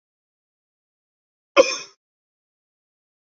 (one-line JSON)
{"cough_length": "3.2 s", "cough_amplitude": 27951, "cough_signal_mean_std_ratio": 0.15, "survey_phase": "beta (2021-08-13 to 2022-03-07)", "age": "45-64", "gender": "Male", "wearing_mask": "No", "symptom_cough_any": true, "symptom_runny_or_blocked_nose": true, "symptom_fatigue": true, "symptom_headache": true, "symptom_change_to_sense_of_smell_or_taste": true, "symptom_loss_of_taste": true, "symptom_onset": "8 days", "smoker_status": "Never smoked", "respiratory_condition_asthma": false, "respiratory_condition_other": false, "recruitment_source": "Test and Trace", "submission_delay": "2 days", "covid_test_result": "Positive", "covid_test_method": "RT-qPCR", "covid_ct_value": 16.7, "covid_ct_gene": "ORF1ab gene", "covid_ct_mean": 18.0, "covid_viral_load": "1200000 copies/ml", "covid_viral_load_category": "High viral load (>1M copies/ml)"}